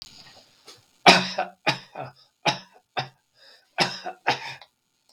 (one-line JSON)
{"three_cough_length": "5.1 s", "three_cough_amplitude": 32766, "three_cough_signal_mean_std_ratio": 0.3, "survey_phase": "beta (2021-08-13 to 2022-03-07)", "age": "65+", "gender": "Male", "wearing_mask": "No", "symptom_none": true, "smoker_status": "Ex-smoker", "respiratory_condition_asthma": true, "respiratory_condition_other": false, "recruitment_source": "REACT", "submission_delay": "1 day", "covid_test_result": "Negative", "covid_test_method": "RT-qPCR", "influenza_a_test_result": "Unknown/Void", "influenza_b_test_result": "Unknown/Void"}